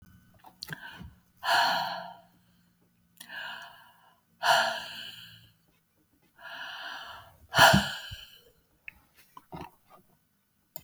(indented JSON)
{
  "exhalation_length": "10.8 s",
  "exhalation_amplitude": 19596,
  "exhalation_signal_mean_std_ratio": 0.32,
  "survey_phase": "beta (2021-08-13 to 2022-03-07)",
  "age": "65+",
  "gender": "Female",
  "wearing_mask": "No",
  "symptom_cough_any": true,
  "smoker_status": "Never smoked",
  "respiratory_condition_asthma": false,
  "respiratory_condition_other": true,
  "recruitment_source": "REACT",
  "submission_delay": "2 days",
  "covid_test_result": "Negative",
  "covid_test_method": "RT-qPCR"
}